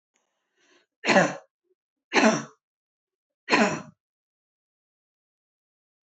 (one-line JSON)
{"three_cough_length": "6.1 s", "three_cough_amplitude": 18985, "three_cough_signal_mean_std_ratio": 0.28, "survey_phase": "beta (2021-08-13 to 2022-03-07)", "age": "45-64", "gender": "Female", "wearing_mask": "No", "symptom_none": true, "smoker_status": "Never smoked", "respiratory_condition_asthma": false, "respiratory_condition_other": false, "recruitment_source": "REACT", "submission_delay": "4 days", "covid_test_result": "Negative", "covid_test_method": "RT-qPCR", "influenza_a_test_result": "Negative", "influenza_b_test_result": "Negative"}